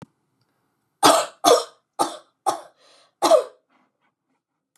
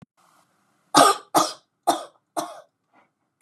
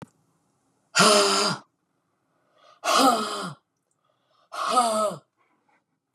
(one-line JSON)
{"three_cough_length": "4.8 s", "three_cough_amplitude": 30124, "three_cough_signal_mean_std_ratio": 0.32, "cough_length": "3.4 s", "cough_amplitude": 31198, "cough_signal_mean_std_ratio": 0.3, "exhalation_length": "6.1 s", "exhalation_amplitude": 21814, "exhalation_signal_mean_std_ratio": 0.43, "survey_phase": "beta (2021-08-13 to 2022-03-07)", "age": "45-64", "gender": "Female", "wearing_mask": "No", "symptom_none": true, "smoker_status": "Never smoked", "respiratory_condition_asthma": false, "respiratory_condition_other": false, "recruitment_source": "REACT", "submission_delay": "3 days", "covid_test_result": "Negative", "covid_test_method": "RT-qPCR", "influenza_a_test_result": "Negative", "influenza_b_test_result": "Negative"}